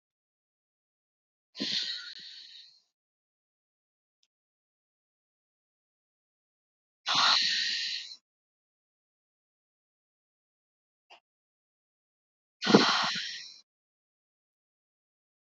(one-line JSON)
{"exhalation_length": "15.4 s", "exhalation_amplitude": 21670, "exhalation_signal_mean_std_ratio": 0.26, "survey_phase": "beta (2021-08-13 to 2022-03-07)", "age": "18-44", "gender": "Female", "wearing_mask": "No", "symptom_cough_any": true, "symptom_runny_or_blocked_nose": true, "symptom_onset": "7 days", "smoker_status": "Never smoked", "respiratory_condition_asthma": false, "respiratory_condition_other": false, "recruitment_source": "Test and Trace", "submission_delay": "2 days", "covid_test_result": "Negative", "covid_test_method": "RT-qPCR"}